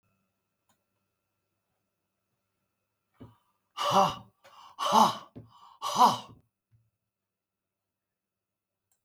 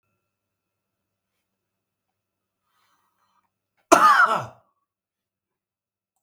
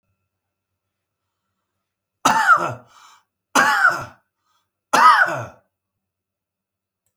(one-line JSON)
{"exhalation_length": "9.0 s", "exhalation_amplitude": 13061, "exhalation_signal_mean_std_ratio": 0.25, "cough_length": "6.2 s", "cough_amplitude": 32768, "cough_signal_mean_std_ratio": 0.22, "three_cough_length": "7.2 s", "three_cough_amplitude": 32385, "three_cough_signal_mean_std_ratio": 0.34, "survey_phase": "beta (2021-08-13 to 2022-03-07)", "age": "65+", "gender": "Male", "wearing_mask": "No", "symptom_none": true, "smoker_status": "Ex-smoker", "respiratory_condition_asthma": false, "respiratory_condition_other": false, "recruitment_source": "REACT", "submission_delay": "2 days", "covid_test_result": "Negative", "covid_test_method": "RT-qPCR", "influenza_a_test_result": "Negative", "influenza_b_test_result": "Negative"}